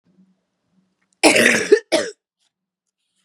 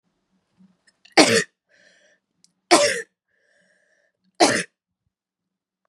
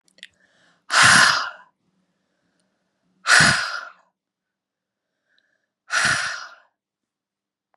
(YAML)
cough_length: 3.2 s
cough_amplitude: 32768
cough_signal_mean_std_ratio: 0.34
three_cough_length: 5.9 s
three_cough_amplitude: 32767
three_cough_signal_mean_std_ratio: 0.26
exhalation_length: 7.8 s
exhalation_amplitude: 30076
exhalation_signal_mean_std_ratio: 0.33
survey_phase: beta (2021-08-13 to 2022-03-07)
age: 18-44
gender: Female
wearing_mask: 'No'
symptom_cough_any: true
symptom_new_continuous_cough: true
symptom_runny_or_blocked_nose: true
symptom_shortness_of_breath: true
symptom_sore_throat: true
symptom_fatigue: true
symptom_headache: true
symptom_change_to_sense_of_smell_or_taste: true
symptom_other: true
symptom_onset: 3 days
smoker_status: Ex-smoker
respiratory_condition_asthma: true
respiratory_condition_other: false
recruitment_source: Test and Trace
submission_delay: 1 day
covid_test_result: Positive
covid_test_method: RT-qPCR
covid_ct_value: 17.9
covid_ct_gene: N gene